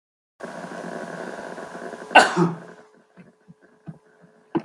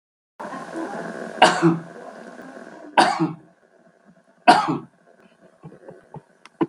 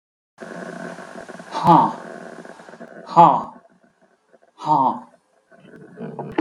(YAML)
cough_length: 4.6 s
cough_amplitude: 32767
cough_signal_mean_std_ratio: 0.32
three_cough_length: 6.7 s
three_cough_amplitude: 32768
three_cough_signal_mean_std_ratio: 0.36
exhalation_length: 6.4 s
exhalation_amplitude: 32761
exhalation_signal_mean_std_ratio: 0.37
survey_phase: beta (2021-08-13 to 2022-03-07)
age: 65+
gender: Male
wearing_mask: 'No'
symptom_none: true
smoker_status: Never smoked
respiratory_condition_asthma: false
respiratory_condition_other: false
recruitment_source: REACT
submission_delay: 4 days
covid_test_result: Negative
covid_test_method: RT-qPCR